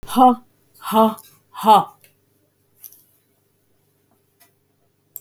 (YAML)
exhalation_length: 5.2 s
exhalation_amplitude: 31369
exhalation_signal_mean_std_ratio: 0.29
survey_phase: beta (2021-08-13 to 2022-03-07)
age: 65+
gender: Female
wearing_mask: 'No'
symptom_none: true
smoker_status: Current smoker (1 to 10 cigarettes per day)
respiratory_condition_asthma: false
respiratory_condition_other: false
recruitment_source: REACT
submission_delay: 4 days
covid_test_result: Negative
covid_test_method: RT-qPCR
influenza_a_test_result: Negative
influenza_b_test_result: Negative